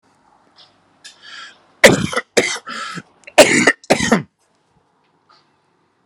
{
  "cough_length": "6.1 s",
  "cough_amplitude": 32768,
  "cough_signal_mean_std_ratio": 0.32,
  "survey_phase": "alpha (2021-03-01 to 2021-08-12)",
  "age": "45-64",
  "gender": "Male",
  "wearing_mask": "No",
  "symptom_cough_any": true,
  "symptom_fatigue": true,
  "symptom_change_to_sense_of_smell_or_taste": true,
  "symptom_onset": "7 days",
  "smoker_status": "Never smoked",
  "respiratory_condition_asthma": false,
  "respiratory_condition_other": false,
  "recruitment_source": "Test and Trace",
  "submission_delay": "3 days",
  "covid_test_result": "Positive",
  "covid_test_method": "RT-qPCR",
  "covid_ct_value": 14.1,
  "covid_ct_gene": "ORF1ab gene",
  "covid_ct_mean": 14.4,
  "covid_viral_load": "19000000 copies/ml",
  "covid_viral_load_category": "High viral load (>1M copies/ml)"
}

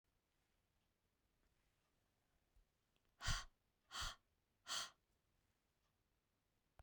{
  "exhalation_length": "6.8 s",
  "exhalation_amplitude": 1328,
  "exhalation_signal_mean_std_ratio": 0.25,
  "survey_phase": "beta (2021-08-13 to 2022-03-07)",
  "age": "45-64",
  "gender": "Female",
  "wearing_mask": "No",
  "symptom_cough_any": true,
  "symptom_runny_or_blocked_nose": true,
  "symptom_shortness_of_breath": true,
  "symptom_sore_throat": true,
  "symptom_abdominal_pain": true,
  "symptom_fatigue": true,
  "symptom_headache": true,
  "smoker_status": "Ex-smoker",
  "respiratory_condition_asthma": false,
  "respiratory_condition_other": false,
  "recruitment_source": "REACT",
  "submission_delay": "2 days",
  "covid_test_result": "Negative",
  "covid_test_method": "RT-qPCR"
}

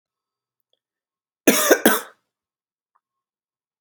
{
  "cough_length": "3.8 s",
  "cough_amplitude": 32768,
  "cough_signal_mean_std_ratio": 0.25,
  "survey_phase": "alpha (2021-03-01 to 2021-08-12)",
  "age": "18-44",
  "gender": "Male",
  "wearing_mask": "No",
  "symptom_cough_any": true,
  "symptom_fatigue": true,
  "symptom_fever_high_temperature": true,
  "symptom_change_to_sense_of_smell_or_taste": true,
  "symptom_onset": "4 days",
  "smoker_status": "Never smoked",
  "respiratory_condition_asthma": true,
  "respiratory_condition_other": false,
  "recruitment_source": "Test and Trace",
  "submission_delay": "1 day",
  "covid_test_result": "Positive",
  "covid_test_method": "RT-qPCR",
  "covid_ct_value": 17.8,
  "covid_ct_gene": "ORF1ab gene",
  "covid_ct_mean": 18.6,
  "covid_viral_load": "810000 copies/ml",
  "covid_viral_load_category": "Low viral load (10K-1M copies/ml)"
}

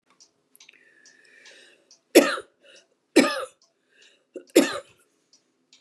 {
  "three_cough_length": "5.8 s",
  "three_cough_amplitude": 28923,
  "three_cough_signal_mean_std_ratio": 0.23,
  "survey_phase": "beta (2021-08-13 to 2022-03-07)",
  "age": "65+",
  "gender": "Female",
  "wearing_mask": "No",
  "symptom_shortness_of_breath": true,
  "smoker_status": "Never smoked",
  "respiratory_condition_asthma": true,
  "respiratory_condition_other": false,
  "recruitment_source": "REACT",
  "submission_delay": "1 day",
  "covid_test_result": "Negative",
  "covid_test_method": "RT-qPCR",
  "influenza_a_test_result": "Negative",
  "influenza_b_test_result": "Negative"
}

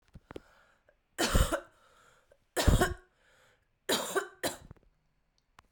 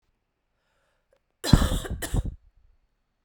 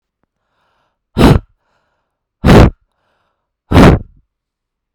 {
  "three_cough_length": "5.7 s",
  "three_cough_amplitude": 10055,
  "three_cough_signal_mean_std_ratio": 0.34,
  "cough_length": "3.2 s",
  "cough_amplitude": 28737,
  "cough_signal_mean_std_ratio": 0.3,
  "exhalation_length": "4.9 s",
  "exhalation_amplitude": 32768,
  "exhalation_signal_mean_std_ratio": 0.34,
  "survey_phase": "beta (2021-08-13 to 2022-03-07)",
  "age": "18-44",
  "gender": "Female",
  "wearing_mask": "No",
  "symptom_cough_any": true,
  "symptom_runny_or_blocked_nose": true,
  "symptom_fatigue": true,
  "symptom_fever_high_temperature": true,
  "symptom_headache": true,
  "symptom_onset": "4 days",
  "smoker_status": "Never smoked",
  "respiratory_condition_asthma": false,
  "respiratory_condition_other": false,
  "recruitment_source": "Test and Trace",
  "submission_delay": "1 day",
  "covid_test_result": "Positive",
  "covid_test_method": "RT-qPCR"
}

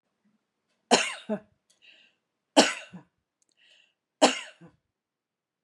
{
  "three_cough_length": "5.6 s",
  "three_cough_amplitude": 27508,
  "three_cough_signal_mean_std_ratio": 0.23,
  "survey_phase": "beta (2021-08-13 to 2022-03-07)",
  "age": "65+",
  "gender": "Female",
  "wearing_mask": "No",
  "symptom_none": true,
  "smoker_status": "Never smoked",
  "respiratory_condition_asthma": false,
  "respiratory_condition_other": false,
  "recruitment_source": "REACT",
  "submission_delay": "2 days",
  "covid_test_result": "Negative",
  "covid_test_method": "RT-qPCR",
  "influenza_a_test_result": "Negative",
  "influenza_b_test_result": "Negative"
}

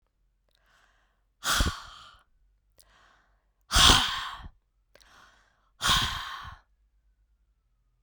{
  "exhalation_length": "8.0 s",
  "exhalation_amplitude": 20192,
  "exhalation_signal_mean_std_ratio": 0.3,
  "survey_phase": "beta (2021-08-13 to 2022-03-07)",
  "age": "45-64",
  "gender": "Female",
  "wearing_mask": "No",
  "symptom_cough_any": true,
  "symptom_runny_or_blocked_nose": true,
  "symptom_fatigue": true,
  "symptom_headache": true,
  "symptom_other": true,
  "smoker_status": "Never smoked",
  "respiratory_condition_asthma": false,
  "respiratory_condition_other": false,
  "recruitment_source": "Test and Trace",
  "submission_delay": "2 days",
  "covid_test_result": "Positive",
  "covid_test_method": "RT-qPCR",
  "covid_ct_value": 23.6,
  "covid_ct_gene": "N gene"
}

